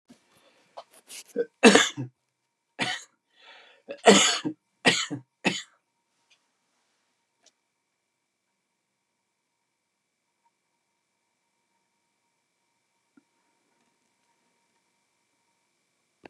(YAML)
three_cough_length: 16.3 s
three_cough_amplitude: 27979
three_cough_signal_mean_std_ratio: 0.19
survey_phase: beta (2021-08-13 to 2022-03-07)
age: 65+
gender: Male
wearing_mask: 'No'
symptom_none: true
smoker_status: Current smoker (1 to 10 cigarettes per day)
respiratory_condition_asthma: false
respiratory_condition_other: false
recruitment_source: REACT
submission_delay: 2 days
covid_test_result: Negative
covid_test_method: RT-qPCR
influenza_a_test_result: Negative
influenza_b_test_result: Negative